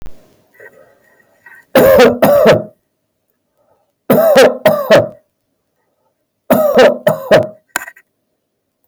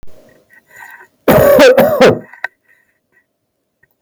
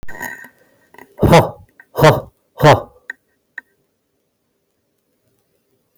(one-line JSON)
{"three_cough_length": "8.9 s", "three_cough_amplitude": 32768, "three_cough_signal_mean_std_ratio": 0.48, "cough_length": "4.0 s", "cough_amplitude": 32767, "cough_signal_mean_std_ratio": 0.45, "exhalation_length": "6.0 s", "exhalation_amplitude": 32768, "exhalation_signal_mean_std_ratio": 0.3, "survey_phase": "beta (2021-08-13 to 2022-03-07)", "age": "45-64", "gender": "Male", "wearing_mask": "No", "symptom_none": true, "smoker_status": "Ex-smoker", "respiratory_condition_asthma": false, "respiratory_condition_other": false, "recruitment_source": "REACT", "submission_delay": "10 days", "covid_test_result": "Negative", "covid_test_method": "RT-qPCR"}